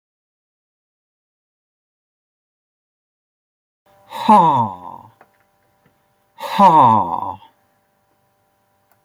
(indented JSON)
{
  "exhalation_length": "9.0 s",
  "exhalation_amplitude": 29523,
  "exhalation_signal_mean_std_ratio": 0.29,
  "survey_phase": "beta (2021-08-13 to 2022-03-07)",
  "age": "45-64",
  "gender": "Male",
  "wearing_mask": "No",
  "symptom_none": true,
  "smoker_status": "Ex-smoker",
  "respiratory_condition_asthma": false,
  "respiratory_condition_other": false,
  "recruitment_source": "REACT",
  "submission_delay": "2 days",
  "covid_test_result": "Negative",
  "covid_test_method": "RT-qPCR"
}